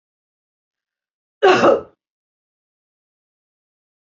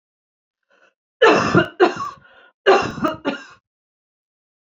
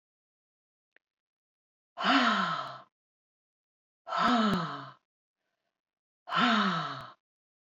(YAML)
cough_length: 4.1 s
cough_amplitude: 26411
cough_signal_mean_std_ratio: 0.24
three_cough_length: 4.7 s
three_cough_amplitude: 32535
three_cough_signal_mean_std_ratio: 0.37
exhalation_length: 7.8 s
exhalation_amplitude: 7988
exhalation_signal_mean_std_ratio: 0.42
survey_phase: beta (2021-08-13 to 2022-03-07)
age: 45-64
gender: Female
wearing_mask: 'No'
symptom_none: true
smoker_status: Never smoked
respiratory_condition_asthma: false
respiratory_condition_other: false
recruitment_source: REACT
submission_delay: 3 days
covid_test_result: Negative
covid_test_method: RT-qPCR
influenza_a_test_result: Negative
influenza_b_test_result: Negative